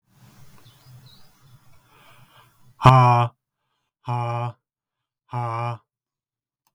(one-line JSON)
{"exhalation_length": "6.7 s", "exhalation_amplitude": 32766, "exhalation_signal_mean_std_ratio": 0.3, "survey_phase": "beta (2021-08-13 to 2022-03-07)", "age": "45-64", "gender": "Male", "wearing_mask": "No", "symptom_none": true, "smoker_status": "Never smoked", "respiratory_condition_asthma": false, "respiratory_condition_other": false, "recruitment_source": "REACT", "submission_delay": "3 days", "covid_test_result": "Negative", "covid_test_method": "RT-qPCR", "influenza_a_test_result": "Negative", "influenza_b_test_result": "Negative"}